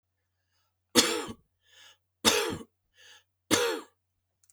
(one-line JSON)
{"three_cough_length": "4.5 s", "three_cough_amplitude": 16107, "three_cough_signal_mean_std_ratio": 0.34, "survey_phase": "beta (2021-08-13 to 2022-03-07)", "age": "45-64", "gender": "Male", "wearing_mask": "No", "symptom_other": true, "smoker_status": "Never smoked", "respiratory_condition_asthma": false, "respiratory_condition_other": false, "recruitment_source": "Test and Trace", "submission_delay": "2 days", "covid_test_result": "Positive", "covid_test_method": "RT-qPCR", "covid_ct_value": 18.4, "covid_ct_gene": "ORF1ab gene"}